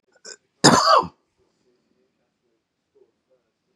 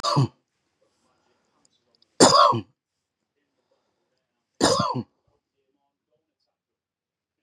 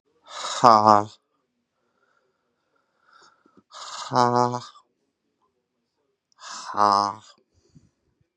{"cough_length": "3.8 s", "cough_amplitude": 32531, "cough_signal_mean_std_ratio": 0.26, "three_cough_length": "7.4 s", "three_cough_amplitude": 27955, "three_cough_signal_mean_std_ratio": 0.27, "exhalation_length": "8.4 s", "exhalation_amplitude": 32767, "exhalation_signal_mean_std_ratio": 0.25, "survey_phase": "beta (2021-08-13 to 2022-03-07)", "age": "45-64", "gender": "Male", "wearing_mask": "No", "symptom_cough_any": true, "symptom_shortness_of_breath": true, "symptom_sore_throat": true, "symptom_diarrhoea": true, "symptom_fatigue": true, "symptom_headache": true, "symptom_change_to_sense_of_smell_or_taste": true, "symptom_loss_of_taste": true, "symptom_onset": "12 days", "smoker_status": "Ex-smoker", "respiratory_condition_asthma": false, "respiratory_condition_other": false, "recruitment_source": "REACT", "submission_delay": "3 days", "covid_test_result": "Negative", "covid_test_method": "RT-qPCR", "covid_ct_value": 39.0, "covid_ct_gene": "N gene", "influenza_a_test_result": "Negative", "influenza_b_test_result": "Negative"}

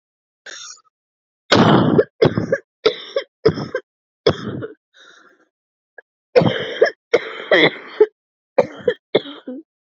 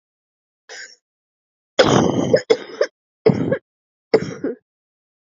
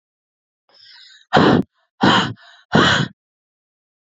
{"cough_length": "10.0 s", "cough_amplitude": 32767, "cough_signal_mean_std_ratio": 0.39, "three_cough_length": "5.4 s", "three_cough_amplitude": 30227, "three_cough_signal_mean_std_ratio": 0.37, "exhalation_length": "4.0 s", "exhalation_amplitude": 32197, "exhalation_signal_mean_std_ratio": 0.39, "survey_phase": "beta (2021-08-13 to 2022-03-07)", "age": "18-44", "gender": "Female", "wearing_mask": "No", "symptom_new_continuous_cough": true, "symptom_runny_or_blocked_nose": true, "symptom_shortness_of_breath": true, "symptom_sore_throat": true, "symptom_fatigue": true, "symptom_headache": true, "symptom_change_to_sense_of_smell_or_taste": true, "symptom_onset": "4 days", "smoker_status": "Current smoker (e-cigarettes or vapes only)", "respiratory_condition_asthma": true, "respiratory_condition_other": false, "recruitment_source": "Test and Trace", "submission_delay": "1 day", "covid_test_result": "Positive", "covid_test_method": "RT-qPCR", "covid_ct_value": 26.7, "covid_ct_gene": "N gene"}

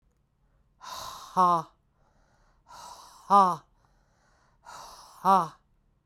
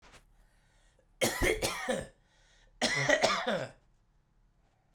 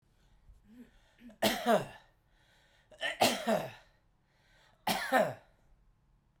{"exhalation_length": "6.1 s", "exhalation_amplitude": 13754, "exhalation_signal_mean_std_ratio": 0.3, "cough_length": "4.9 s", "cough_amplitude": 9638, "cough_signal_mean_std_ratio": 0.46, "three_cough_length": "6.4 s", "three_cough_amplitude": 8157, "three_cough_signal_mean_std_ratio": 0.37, "survey_phase": "beta (2021-08-13 to 2022-03-07)", "age": "18-44", "gender": "Male", "wearing_mask": "No", "symptom_runny_or_blocked_nose": true, "symptom_fatigue": true, "symptom_onset": "4 days", "smoker_status": "Never smoked", "respiratory_condition_asthma": true, "respiratory_condition_other": false, "recruitment_source": "Test and Trace", "submission_delay": "2 days", "covid_test_result": "Positive", "covid_test_method": "RT-qPCR", "covid_ct_value": 14.8, "covid_ct_gene": "ORF1ab gene", "covid_ct_mean": 15.2, "covid_viral_load": "11000000 copies/ml", "covid_viral_load_category": "High viral load (>1M copies/ml)"}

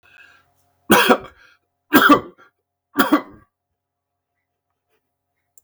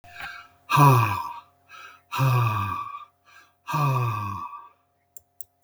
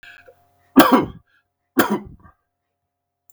{"three_cough_length": "5.6 s", "three_cough_amplitude": 32768, "three_cough_signal_mean_std_ratio": 0.29, "exhalation_length": "5.6 s", "exhalation_amplitude": 19820, "exhalation_signal_mean_std_ratio": 0.51, "cough_length": "3.3 s", "cough_amplitude": 32768, "cough_signal_mean_std_ratio": 0.29, "survey_phase": "beta (2021-08-13 to 2022-03-07)", "age": "45-64", "gender": "Male", "wearing_mask": "No", "symptom_none": true, "smoker_status": "Never smoked", "respiratory_condition_asthma": false, "respiratory_condition_other": false, "recruitment_source": "REACT", "submission_delay": "2 days", "covid_test_result": "Negative", "covid_test_method": "RT-qPCR"}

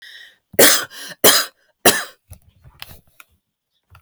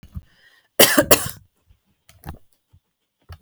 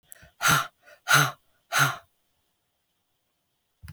{"three_cough_length": "4.0 s", "three_cough_amplitude": 32768, "three_cough_signal_mean_std_ratio": 0.31, "cough_length": "3.4 s", "cough_amplitude": 32768, "cough_signal_mean_std_ratio": 0.25, "exhalation_length": "3.9 s", "exhalation_amplitude": 18830, "exhalation_signal_mean_std_ratio": 0.33, "survey_phase": "alpha (2021-03-01 to 2021-08-12)", "age": "45-64", "gender": "Female", "wearing_mask": "No", "symptom_none": true, "smoker_status": "Never smoked", "respiratory_condition_asthma": true, "respiratory_condition_other": false, "recruitment_source": "REACT", "submission_delay": "2 days", "covid_test_result": "Negative", "covid_test_method": "RT-qPCR"}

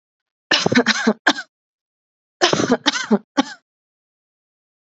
{"cough_length": "4.9 s", "cough_amplitude": 30728, "cough_signal_mean_std_ratio": 0.37, "survey_phase": "beta (2021-08-13 to 2022-03-07)", "age": "18-44", "gender": "Female", "wearing_mask": "No", "symptom_new_continuous_cough": true, "symptom_runny_or_blocked_nose": true, "symptom_sore_throat": true, "symptom_fatigue": true, "symptom_fever_high_temperature": true, "symptom_headache": true, "symptom_onset": "3 days", "smoker_status": "Ex-smoker", "respiratory_condition_asthma": false, "respiratory_condition_other": false, "recruitment_source": "Test and Trace", "submission_delay": "1 day", "covid_test_result": "Positive", "covid_test_method": "ePCR"}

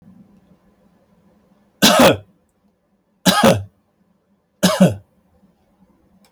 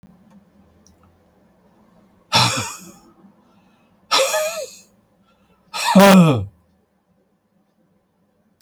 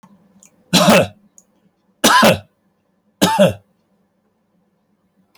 {"cough_length": "6.3 s", "cough_amplitude": 32768, "cough_signal_mean_std_ratio": 0.32, "exhalation_length": "8.6 s", "exhalation_amplitude": 32768, "exhalation_signal_mean_std_ratio": 0.32, "three_cough_length": "5.4 s", "three_cough_amplitude": 32768, "three_cough_signal_mean_std_ratio": 0.35, "survey_phase": "alpha (2021-03-01 to 2021-08-12)", "age": "65+", "gender": "Male", "wearing_mask": "No", "symptom_cough_any": true, "symptom_loss_of_taste": true, "smoker_status": "Never smoked", "respiratory_condition_asthma": false, "respiratory_condition_other": false, "recruitment_source": "Test and Trace", "submission_delay": "2 days", "covid_test_result": "Positive", "covid_test_method": "RT-qPCR"}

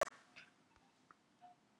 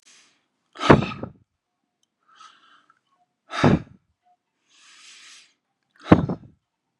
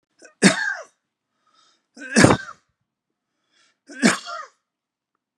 {"cough_length": "1.8 s", "cough_amplitude": 2338, "cough_signal_mean_std_ratio": 0.19, "exhalation_length": "7.0 s", "exhalation_amplitude": 32768, "exhalation_signal_mean_std_ratio": 0.22, "three_cough_length": "5.4 s", "three_cough_amplitude": 32768, "three_cough_signal_mean_std_ratio": 0.28, "survey_phase": "beta (2021-08-13 to 2022-03-07)", "age": "65+", "gender": "Male", "wearing_mask": "No", "symptom_none": true, "smoker_status": "Never smoked", "respiratory_condition_asthma": false, "respiratory_condition_other": false, "recruitment_source": "REACT", "submission_delay": "1 day", "covid_test_result": "Negative", "covid_test_method": "RT-qPCR", "influenza_a_test_result": "Negative", "influenza_b_test_result": "Negative"}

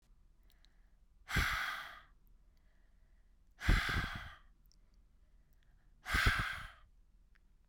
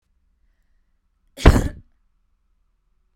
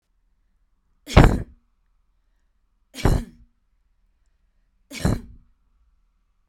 {"exhalation_length": "7.7 s", "exhalation_amplitude": 4669, "exhalation_signal_mean_std_ratio": 0.39, "cough_length": "3.2 s", "cough_amplitude": 32768, "cough_signal_mean_std_ratio": 0.19, "three_cough_length": "6.5 s", "three_cough_amplitude": 32768, "three_cough_signal_mean_std_ratio": 0.22, "survey_phase": "beta (2021-08-13 to 2022-03-07)", "age": "18-44", "gender": "Female", "wearing_mask": "No", "symptom_none": true, "smoker_status": "Current smoker (e-cigarettes or vapes only)", "respiratory_condition_asthma": false, "respiratory_condition_other": false, "recruitment_source": "REACT", "submission_delay": "3 days", "covid_test_result": "Negative", "covid_test_method": "RT-qPCR", "influenza_a_test_result": "Negative", "influenza_b_test_result": "Negative"}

